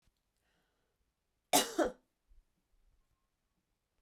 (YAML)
cough_length: 4.0 s
cough_amplitude: 5935
cough_signal_mean_std_ratio: 0.2
survey_phase: beta (2021-08-13 to 2022-03-07)
age: 45-64
gender: Female
wearing_mask: 'No'
symptom_runny_or_blocked_nose: true
symptom_sore_throat: true
symptom_abdominal_pain: true
symptom_fatigue: true
symptom_headache: true
symptom_change_to_sense_of_smell_or_taste: true
symptom_other: true
symptom_onset: 7 days
smoker_status: Ex-smoker
respiratory_condition_asthma: false
respiratory_condition_other: false
recruitment_source: Test and Trace
submission_delay: 2 days
covid_test_result: Positive
covid_test_method: ePCR